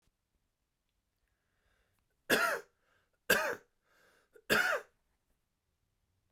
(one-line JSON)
{"three_cough_length": "6.3 s", "three_cough_amplitude": 6487, "three_cough_signal_mean_std_ratio": 0.29, "survey_phase": "beta (2021-08-13 to 2022-03-07)", "age": "45-64", "gender": "Male", "wearing_mask": "No", "symptom_cough_any": true, "symptom_runny_or_blocked_nose": true, "symptom_shortness_of_breath": true, "symptom_sore_throat": true, "symptom_fatigue": true, "symptom_headache": true, "smoker_status": "Never smoked", "respiratory_condition_asthma": false, "respiratory_condition_other": false, "recruitment_source": "Test and Trace", "submission_delay": "3 days", "covid_test_result": "Positive", "covid_test_method": "RT-qPCR", "covid_ct_value": 25.5, "covid_ct_gene": "ORF1ab gene"}